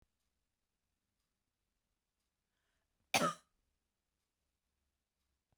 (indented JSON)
{
  "cough_length": "5.6 s",
  "cough_amplitude": 4453,
  "cough_signal_mean_std_ratio": 0.14,
  "survey_phase": "beta (2021-08-13 to 2022-03-07)",
  "age": "45-64",
  "gender": "Female",
  "wearing_mask": "No",
  "symptom_cough_any": true,
  "symptom_runny_or_blocked_nose": true,
  "symptom_shortness_of_breath": true,
  "symptom_sore_throat": true,
  "symptom_fatigue": true,
  "symptom_headache": true,
  "symptom_onset": "2 days",
  "smoker_status": "Never smoked",
  "respiratory_condition_asthma": false,
  "respiratory_condition_other": false,
  "recruitment_source": "Test and Trace",
  "submission_delay": "2 days",
  "covid_test_result": "Positive",
  "covid_test_method": "RT-qPCR",
  "covid_ct_value": 21.3,
  "covid_ct_gene": "ORF1ab gene",
  "covid_ct_mean": 22.4,
  "covid_viral_load": "46000 copies/ml",
  "covid_viral_load_category": "Low viral load (10K-1M copies/ml)"
}